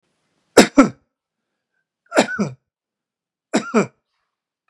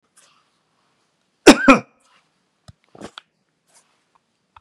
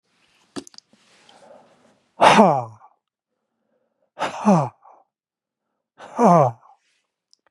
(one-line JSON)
{"three_cough_length": "4.7 s", "three_cough_amplitude": 32768, "three_cough_signal_mean_std_ratio": 0.26, "cough_length": "4.6 s", "cough_amplitude": 32768, "cough_signal_mean_std_ratio": 0.17, "exhalation_length": "7.5 s", "exhalation_amplitude": 32482, "exhalation_signal_mean_std_ratio": 0.29, "survey_phase": "beta (2021-08-13 to 2022-03-07)", "age": "65+", "gender": "Male", "wearing_mask": "No", "symptom_cough_any": true, "smoker_status": "Never smoked", "respiratory_condition_asthma": true, "respiratory_condition_other": false, "recruitment_source": "REACT", "submission_delay": "1 day", "covid_test_result": "Negative", "covid_test_method": "RT-qPCR", "influenza_a_test_result": "Negative", "influenza_b_test_result": "Negative"}